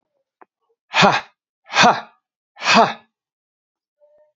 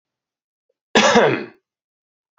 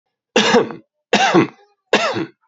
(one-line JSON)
{"exhalation_length": "4.4 s", "exhalation_amplitude": 32586, "exhalation_signal_mean_std_ratio": 0.33, "cough_length": "2.4 s", "cough_amplitude": 30288, "cough_signal_mean_std_ratio": 0.35, "three_cough_length": "2.5 s", "three_cough_amplitude": 32737, "three_cough_signal_mean_std_ratio": 0.52, "survey_phase": "beta (2021-08-13 to 2022-03-07)", "age": "18-44", "gender": "Male", "wearing_mask": "No", "symptom_cough_any": true, "symptom_sore_throat": true, "symptom_fatigue": true, "symptom_fever_high_temperature": true, "symptom_headache": true, "symptom_change_to_sense_of_smell_or_taste": true, "smoker_status": "Never smoked", "respiratory_condition_asthma": false, "respiratory_condition_other": false, "recruitment_source": "Test and Trace", "submission_delay": "4 days", "covid_test_result": "Positive", "covid_test_method": "LFT"}